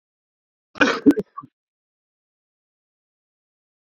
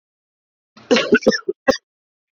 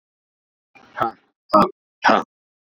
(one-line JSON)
{"cough_length": "3.9 s", "cough_amplitude": 26060, "cough_signal_mean_std_ratio": 0.2, "three_cough_length": "2.4 s", "three_cough_amplitude": 27616, "three_cough_signal_mean_std_ratio": 0.33, "exhalation_length": "2.6 s", "exhalation_amplitude": 28069, "exhalation_signal_mean_std_ratio": 0.3, "survey_phase": "beta (2021-08-13 to 2022-03-07)", "age": "18-44", "gender": "Male", "wearing_mask": "Yes", "symptom_none": true, "smoker_status": "Current smoker (11 or more cigarettes per day)", "respiratory_condition_asthma": false, "respiratory_condition_other": false, "recruitment_source": "REACT", "submission_delay": "1 day", "covid_test_result": "Negative", "covid_test_method": "RT-qPCR"}